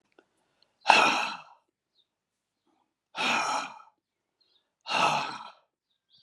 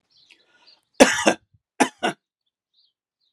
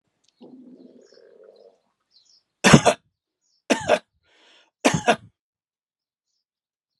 {
  "exhalation_length": "6.2 s",
  "exhalation_amplitude": 29262,
  "exhalation_signal_mean_std_ratio": 0.35,
  "cough_length": "3.3 s",
  "cough_amplitude": 32768,
  "cough_signal_mean_std_ratio": 0.24,
  "three_cough_length": "7.0 s",
  "three_cough_amplitude": 32768,
  "three_cough_signal_mean_std_ratio": 0.23,
  "survey_phase": "alpha (2021-03-01 to 2021-08-12)",
  "age": "65+",
  "gender": "Male",
  "wearing_mask": "No",
  "symptom_none": true,
  "smoker_status": "Never smoked",
  "respiratory_condition_asthma": false,
  "respiratory_condition_other": false,
  "recruitment_source": "REACT",
  "submission_delay": "2 days",
  "covid_test_result": "Negative",
  "covid_test_method": "RT-qPCR"
}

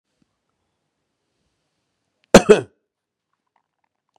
{
  "cough_length": "4.2 s",
  "cough_amplitude": 32768,
  "cough_signal_mean_std_ratio": 0.15,
  "survey_phase": "beta (2021-08-13 to 2022-03-07)",
  "age": "45-64",
  "gender": "Male",
  "wearing_mask": "No",
  "symptom_none": true,
  "symptom_onset": "12 days",
  "smoker_status": "Current smoker (11 or more cigarettes per day)",
  "respiratory_condition_asthma": false,
  "respiratory_condition_other": false,
  "recruitment_source": "REACT",
  "submission_delay": "1 day",
  "covid_test_result": "Negative",
  "covid_test_method": "RT-qPCR",
  "influenza_a_test_result": "Negative",
  "influenza_b_test_result": "Negative"
}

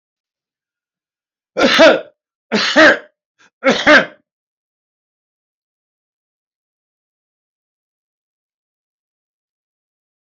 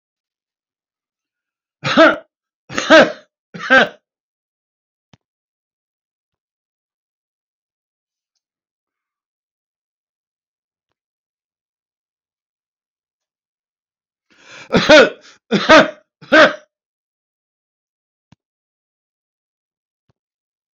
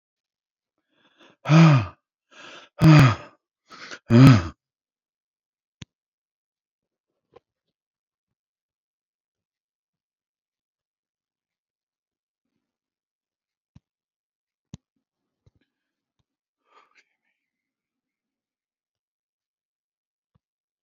{
  "cough_length": "10.3 s",
  "cough_amplitude": 32768,
  "cough_signal_mean_std_ratio": 0.26,
  "three_cough_length": "20.7 s",
  "three_cough_amplitude": 32767,
  "three_cough_signal_mean_std_ratio": 0.22,
  "exhalation_length": "20.8 s",
  "exhalation_amplitude": 26213,
  "exhalation_signal_mean_std_ratio": 0.18,
  "survey_phase": "alpha (2021-03-01 to 2021-08-12)",
  "age": "65+",
  "gender": "Male",
  "wearing_mask": "No",
  "symptom_none": true,
  "symptom_cough_any": true,
  "smoker_status": "Ex-smoker",
  "respiratory_condition_asthma": true,
  "respiratory_condition_other": false,
  "recruitment_source": "REACT",
  "submission_delay": "3 days",
  "covid_test_result": "Negative",
  "covid_test_method": "RT-qPCR"
}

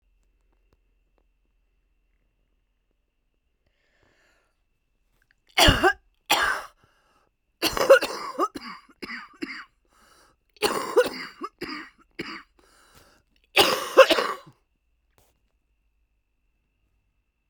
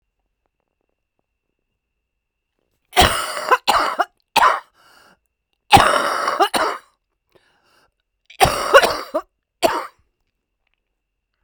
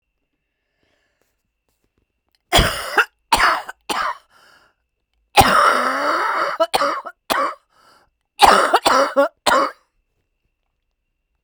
{
  "exhalation_length": "17.5 s",
  "exhalation_amplitude": 27304,
  "exhalation_signal_mean_std_ratio": 0.27,
  "three_cough_length": "11.4 s",
  "three_cough_amplitude": 32768,
  "three_cough_signal_mean_std_ratio": 0.35,
  "cough_length": "11.4 s",
  "cough_amplitude": 32768,
  "cough_signal_mean_std_ratio": 0.44,
  "survey_phase": "beta (2021-08-13 to 2022-03-07)",
  "age": "65+",
  "gender": "Female",
  "wearing_mask": "No",
  "symptom_new_continuous_cough": true,
  "symptom_runny_or_blocked_nose": true,
  "symptom_sore_throat": true,
  "symptom_fatigue": true,
  "symptom_headache": true,
  "symptom_change_to_sense_of_smell_or_taste": true,
  "symptom_onset": "4 days",
  "smoker_status": "Ex-smoker",
  "respiratory_condition_asthma": false,
  "respiratory_condition_other": false,
  "recruitment_source": "Test and Trace",
  "submission_delay": "2 days",
  "covid_test_result": "Positive",
  "covid_test_method": "RT-qPCR",
  "covid_ct_value": 17.3,
  "covid_ct_gene": "ORF1ab gene",
  "covid_ct_mean": 17.6,
  "covid_viral_load": "1700000 copies/ml",
  "covid_viral_load_category": "High viral load (>1M copies/ml)"
}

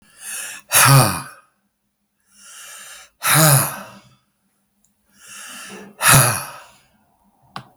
{
  "exhalation_length": "7.8 s",
  "exhalation_amplitude": 32767,
  "exhalation_signal_mean_std_ratio": 0.37,
  "survey_phase": "beta (2021-08-13 to 2022-03-07)",
  "age": "65+",
  "gender": "Male",
  "wearing_mask": "No",
  "symptom_none": true,
  "smoker_status": "Ex-smoker",
  "respiratory_condition_asthma": false,
  "respiratory_condition_other": false,
  "recruitment_source": "REACT",
  "submission_delay": "2 days",
  "covid_test_result": "Negative",
  "covid_test_method": "RT-qPCR"
}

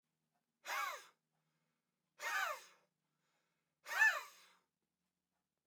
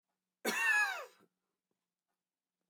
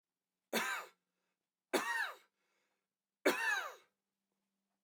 {
  "exhalation_length": "5.7 s",
  "exhalation_amplitude": 2827,
  "exhalation_signal_mean_std_ratio": 0.3,
  "cough_length": "2.7 s",
  "cough_amplitude": 2868,
  "cough_signal_mean_std_ratio": 0.37,
  "three_cough_length": "4.8 s",
  "three_cough_amplitude": 3833,
  "three_cough_signal_mean_std_ratio": 0.37,
  "survey_phase": "alpha (2021-03-01 to 2021-08-12)",
  "age": "45-64",
  "gender": "Male",
  "wearing_mask": "No",
  "symptom_none": true,
  "symptom_onset": "12 days",
  "smoker_status": "Never smoked",
  "respiratory_condition_asthma": false,
  "respiratory_condition_other": false,
  "recruitment_source": "REACT",
  "submission_delay": "1 day",
  "covid_test_result": "Negative",
  "covid_test_method": "RT-qPCR"
}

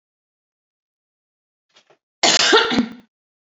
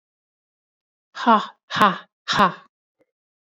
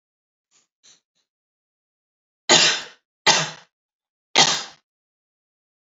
{
  "cough_length": "3.5 s",
  "cough_amplitude": 32591,
  "cough_signal_mean_std_ratio": 0.33,
  "exhalation_length": "3.4 s",
  "exhalation_amplitude": 27657,
  "exhalation_signal_mean_std_ratio": 0.32,
  "three_cough_length": "5.8 s",
  "three_cough_amplitude": 29585,
  "three_cough_signal_mean_std_ratio": 0.27,
  "survey_phase": "beta (2021-08-13 to 2022-03-07)",
  "age": "18-44",
  "gender": "Female",
  "wearing_mask": "No",
  "symptom_headache": true,
  "symptom_change_to_sense_of_smell_or_taste": true,
  "smoker_status": "Never smoked",
  "respiratory_condition_asthma": false,
  "respiratory_condition_other": false,
  "recruitment_source": "Test and Trace",
  "submission_delay": "1 day",
  "covid_test_result": "Negative",
  "covid_test_method": "RT-qPCR"
}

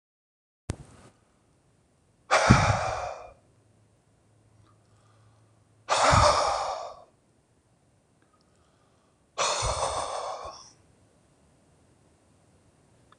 {
  "exhalation_length": "13.2 s",
  "exhalation_amplitude": 23837,
  "exhalation_signal_mean_std_ratio": 0.34,
  "survey_phase": "beta (2021-08-13 to 2022-03-07)",
  "age": "65+",
  "gender": "Male",
  "wearing_mask": "No",
  "symptom_change_to_sense_of_smell_or_taste": true,
  "smoker_status": "Ex-smoker",
  "respiratory_condition_asthma": true,
  "respiratory_condition_other": true,
  "recruitment_source": "REACT",
  "submission_delay": "3 days",
  "covid_test_result": "Negative",
  "covid_test_method": "RT-qPCR"
}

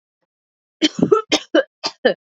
{
  "three_cough_length": "2.3 s",
  "three_cough_amplitude": 30165,
  "three_cough_signal_mean_std_ratio": 0.37,
  "survey_phase": "beta (2021-08-13 to 2022-03-07)",
  "age": "18-44",
  "gender": "Female",
  "wearing_mask": "No",
  "symptom_runny_or_blocked_nose": true,
  "symptom_abdominal_pain": true,
  "symptom_diarrhoea": true,
  "symptom_fatigue": true,
  "symptom_headache": true,
  "smoker_status": "Never smoked",
  "respiratory_condition_asthma": false,
  "respiratory_condition_other": false,
  "recruitment_source": "REACT",
  "submission_delay": "0 days",
  "covid_test_result": "Negative",
  "covid_test_method": "RT-qPCR",
  "influenza_a_test_result": "Negative",
  "influenza_b_test_result": "Negative"
}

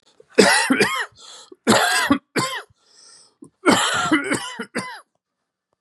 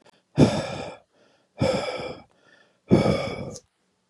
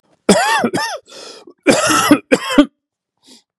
{
  "three_cough_length": "5.8 s",
  "three_cough_amplitude": 32767,
  "three_cough_signal_mean_std_ratio": 0.51,
  "exhalation_length": "4.1 s",
  "exhalation_amplitude": 20893,
  "exhalation_signal_mean_std_ratio": 0.42,
  "cough_length": "3.6 s",
  "cough_amplitude": 32768,
  "cough_signal_mean_std_ratio": 0.5,
  "survey_phase": "beta (2021-08-13 to 2022-03-07)",
  "age": "18-44",
  "gender": "Male",
  "wearing_mask": "No",
  "symptom_cough_any": true,
  "symptom_runny_or_blocked_nose": true,
  "symptom_shortness_of_breath": true,
  "symptom_sore_throat": true,
  "symptom_fatigue": true,
  "symptom_onset": "3 days",
  "smoker_status": "Never smoked",
  "respiratory_condition_asthma": false,
  "respiratory_condition_other": false,
  "recruitment_source": "Test and Trace",
  "submission_delay": "2 days",
  "covid_test_result": "Positive",
  "covid_test_method": "RT-qPCR",
  "covid_ct_value": 22.0,
  "covid_ct_gene": "ORF1ab gene",
  "covid_ct_mean": 22.8,
  "covid_viral_load": "34000 copies/ml",
  "covid_viral_load_category": "Low viral load (10K-1M copies/ml)"
}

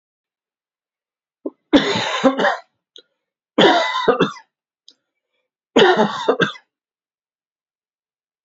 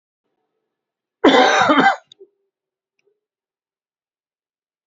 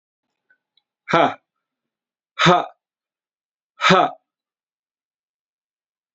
{
  "three_cough_length": "8.4 s",
  "three_cough_amplitude": 30974,
  "three_cough_signal_mean_std_ratio": 0.37,
  "cough_length": "4.9 s",
  "cough_amplitude": 32118,
  "cough_signal_mean_std_ratio": 0.31,
  "exhalation_length": "6.1 s",
  "exhalation_amplitude": 28608,
  "exhalation_signal_mean_std_ratio": 0.26,
  "survey_phase": "beta (2021-08-13 to 2022-03-07)",
  "age": "18-44",
  "gender": "Male",
  "wearing_mask": "No",
  "symptom_cough_any": true,
  "symptom_sore_throat": true,
  "symptom_onset": "3 days",
  "smoker_status": "Never smoked",
  "respiratory_condition_asthma": false,
  "respiratory_condition_other": false,
  "recruitment_source": "Test and Trace",
  "submission_delay": "2 days",
  "covid_test_result": "Positive",
  "covid_test_method": "ePCR"
}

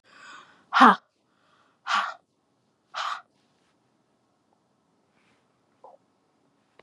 {
  "exhalation_length": "6.8 s",
  "exhalation_amplitude": 27218,
  "exhalation_signal_mean_std_ratio": 0.2,
  "survey_phase": "beta (2021-08-13 to 2022-03-07)",
  "age": "65+",
  "gender": "Female",
  "wearing_mask": "No",
  "symptom_none": true,
  "smoker_status": "Never smoked",
  "respiratory_condition_asthma": false,
  "respiratory_condition_other": false,
  "recruitment_source": "REACT",
  "submission_delay": "2 days",
  "covid_test_result": "Negative",
  "covid_test_method": "RT-qPCR",
  "influenza_a_test_result": "Negative",
  "influenza_b_test_result": "Negative"
}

